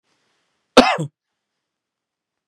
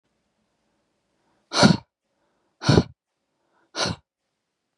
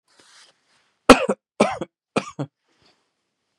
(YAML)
cough_length: 2.5 s
cough_amplitude: 32768
cough_signal_mean_std_ratio: 0.21
exhalation_length: 4.8 s
exhalation_amplitude: 30652
exhalation_signal_mean_std_ratio: 0.24
three_cough_length: 3.6 s
three_cough_amplitude: 32768
three_cough_signal_mean_std_ratio: 0.21
survey_phase: beta (2021-08-13 to 2022-03-07)
age: 18-44
gender: Male
wearing_mask: 'No'
symptom_none: true
smoker_status: Never smoked
respiratory_condition_asthma: false
respiratory_condition_other: false
recruitment_source: REACT
submission_delay: 5 days
covid_test_result: Negative
covid_test_method: RT-qPCR
influenza_a_test_result: Negative
influenza_b_test_result: Negative